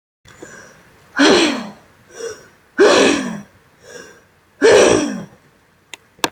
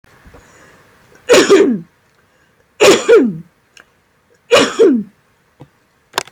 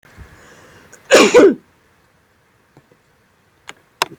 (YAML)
exhalation_length: 6.3 s
exhalation_amplitude: 30518
exhalation_signal_mean_std_ratio: 0.43
three_cough_length: 6.3 s
three_cough_amplitude: 32767
three_cough_signal_mean_std_ratio: 0.42
cough_length: 4.2 s
cough_amplitude: 30655
cough_signal_mean_std_ratio: 0.28
survey_phase: beta (2021-08-13 to 2022-03-07)
age: 18-44
gender: Female
wearing_mask: 'No'
symptom_none: true
smoker_status: Never smoked
respiratory_condition_asthma: true
respiratory_condition_other: false
recruitment_source: REACT
submission_delay: 3 days
covid_test_result: Negative
covid_test_method: RT-qPCR